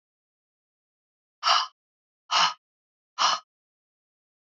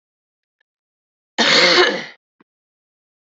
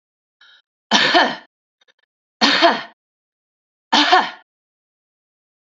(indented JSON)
{
  "exhalation_length": "4.4 s",
  "exhalation_amplitude": 13534,
  "exhalation_signal_mean_std_ratio": 0.29,
  "cough_length": "3.2 s",
  "cough_amplitude": 29936,
  "cough_signal_mean_std_ratio": 0.36,
  "three_cough_length": "5.6 s",
  "three_cough_amplitude": 32767,
  "three_cough_signal_mean_std_ratio": 0.36,
  "survey_phase": "beta (2021-08-13 to 2022-03-07)",
  "age": "45-64",
  "gender": "Female",
  "wearing_mask": "No",
  "symptom_cough_any": true,
  "symptom_runny_or_blocked_nose": true,
  "smoker_status": "Never smoked",
  "respiratory_condition_asthma": false,
  "respiratory_condition_other": false,
  "recruitment_source": "Test and Trace",
  "submission_delay": "0 days",
  "covid_test_result": "Negative",
  "covid_test_method": "RT-qPCR"
}